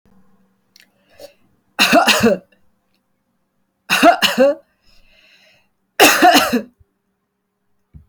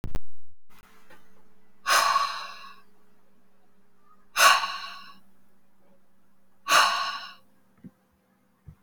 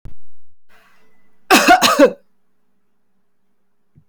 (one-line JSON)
{"three_cough_length": "8.1 s", "three_cough_amplitude": 32767, "three_cough_signal_mean_std_ratio": 0.38, "exhalation_length": "8.8 s", "exhalation_amplitude": 21481, "exhalation_signal_mean_std_ratio": 0.46, "cough_length": "4.1 s", "cough_amplitude": 32768, "cough_signal_mean_std_ratio": 0.4, "survey_phase": "beta (2021-08-13 to 2022-03-07)", "age": "18-44", "gender": "Female", "wearing_mask": "No", "symptom_sore_throat": true, "symptom_onset": "1 day", "smoker_status": "Never smoked", "respiratory_condition_asthma": false, "respiratory_condition_other": false, "recruitment_source": "Test and Trace", "submission_delay": "1 day", "covid_test_result": "Negative", "covid_test_method": "RT-qPCR"}